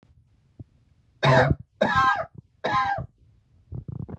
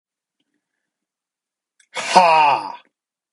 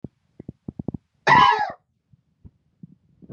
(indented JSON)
{
  "three_cough_length": "4.2 s",
  "three_cough_amplitude": 16412,
  "three_cough_signal_mean_std_ratio": 0.46,
  "exhalation_length": "3.3 s",
  "exhalation_amplitude": 32768,
  "exhalation_signal_mean_std_ratio": 0.34,
  "cough_length": "3.3 s",
  "cough_amplitude": 25449,
  "cough_signal_mean_std_ratio": 0.3,
  "survey_phase": "beta (2021-08-13 to 2022-03-07)",
  "age": "18-44",
  "gender": "Male",
  "wearing_mask": "No",
  "symptom_cough_any": true,
  "symptom_runny_or_blocked_nose": true,
  "symptom_onset": "8 days",
  "smoker_status": "Ex-smoker",
  "respiratory_condition_asthma": true,
  "respiratory_condition_other": false,
  "recruitment_source": "REACT",
  "submission_delay": "1 day",
  "covid_test_result": "Negative",
  "covid_test_method": "RT-qPCR",
  "influenza_a_test_result": "Unknown/Void",
  "influenza_b_test_result": "Unknown/Void"
}